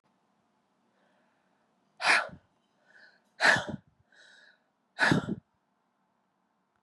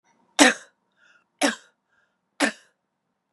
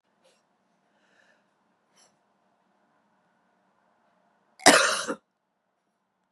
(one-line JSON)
{"exhalation_length": "6.8 s", "exhalation_amplitude": 10861, "exhalation_signal_mean_std_ratio": 0.27, "three_cough_length": "3.3 s", "three_cough_amplitude": 32767, "three_cough_signal_mean_std_ratio": 0.24, "cough_length": "6.3 s", "cough_amplitude": 32767, "cough_signal_mean_std_ratio": 0.18, "survey_phase": "beta (2021-08-13 to 2022-03-07)", "age": "45-64", "gender": "Female", "wearing_mask": "No", "symptom_cough_any": true, "symptom_new_continuous_cough": true, "symptom_runny_or_blocked_nose": true, "symptom_sore_throat": true, "symptom_abdominal_pain": true, "symptom_fatigue": true, "symptom_fever_high_temperature": true, "symptom_headache": true, "symptom_other": true, "symptom_onset": "3 days", "smoker_status": "Never smoked", "respiratory_condition_asthma": false, "respiratory_condition_other": false, "recruitment_source": "Test and Trace", "submission_delay": "2 days", "covid_test_result": "Positive", "covid_test_method": "RT-qPCR", "covid_ct_value": 21.7, "covid_ct_gene": "ORF1ab gene", "covid_ct_mean": 22.1, "covid_viral_load": "56000 copies/ml", "covid_viral_load_category": "Low viral load (10K-1M copies/ml)"}